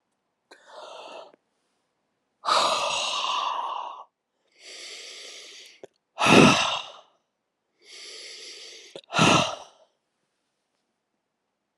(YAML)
exhalation_length: 11.8 s
exhalation_amplitude: 26516
exhalation_signal_mean_std_ratio: 0.35
survey_phase: beta (2021-08-13 to 2022-03-07)
age: 45-64
gender: Female
wearing_mask: 'No'
symptom_new_continuous_cough: true
symptom_runny_or_blocked_nose: true
symptom_shortness_of_breath: true
symptom_sore_throat: true
symptom_fatigue: true
symptom_change_to_sense_of_smell_or_taste: true
symptom_loss_of_taste: true
symptom_onset: 4 days
smoker_status: Ex-smoker
respiratory_condition_asthma: false
respiratory_condition_other: true
recruitment_source: Test and Trace
submission_delay: 2 days
covid_test_result: Positive
covid_test_method: RT-qPCR
covid_ct_value: 16.3
covid_ct_gene: ORF1ab gene
covid_ct_mean: 17.0
covid_viral_load: 2700000 copies/ml
covid_viral_load_category: High viral load (>1M copies/ml)